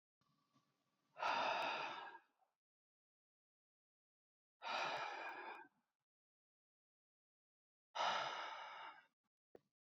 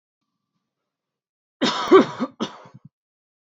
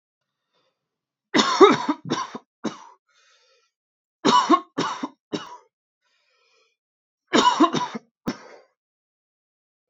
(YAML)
exhalation_length: 9.9 s
exhalation_amplitude: 1211
exhalation_signal_mean_std_ratio: 0.42
cough_length: 3.6 s
cough_amplitude: 26195
cough_signal_mean_std_ratio: 0.27
three_cough_length: 9.9 s
three_cough_amplitude: 27476
three_cough_signal_mean_std_ratio: 0.32
survey_phase: beta (2021-08-13 to 2022-03-07)
age: 18-44
gender: Male
wearing_mask: 'No'
symptom_none: true
smoker_status: Never smoked
respiratory_condition_asthma: false
respiratory_condition_other: false
recruitment_source: REACT
submission_delay: 3 days
covid_test_result: Negative
covid_test_method: RT-qPCR
influenza_a_test_result: Negative
influenza_b_test_result: Negative